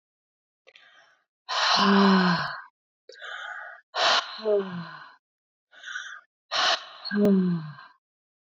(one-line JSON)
{"exhalation_length": "8.5 s", "exhalation_amplitude": 14150, "exhalation_signal_mean_std_ratio": 0.51, "survey_phase": "beta (2021-08-13 to 2022-03-07)", "age": "45-64", "gender": "Female", "wearing_mask": "No", "symptom_runny_or_blocked_nose": true, "symptom_fatigue": true, "symptom_headache": true, "smoker_status": "Never smoked", "respiratory_condition_asthma": false, "respiratory_condition_other": false, "recruitment_source": "Test and Trace", "submission_delay": "2 days", "covid_test_result": "Positive", "covid_test_method": "RT-qPCR", "covid_ct_value": 22.0, "covid_ct_gene": "ORF1ab gene"}